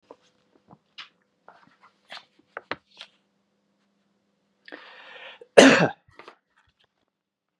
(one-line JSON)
{"cough_length": "7.6 s", "cough_amplitude": 32768, "cough_signal_mean_std_ratio": 0.17, "survey_phase": "beta (2021-08-13 to 2022-03-07)", "age": "45-64", "gender": "Male", "wearing_mask": "No", "symptom_none": true, "smoker_status": "Never smoked", "respiratory_condition_asthma": false, "respiratory_condition_other": false, "recruitment_source": "Test and Trace", "submission_delay": "1 day", "covid_test_result": "Positive", "covid_test_method": "RT-qPCR", "covid_ct_value": 25.7, "covid_ct_gene": "ORF1ab gene"}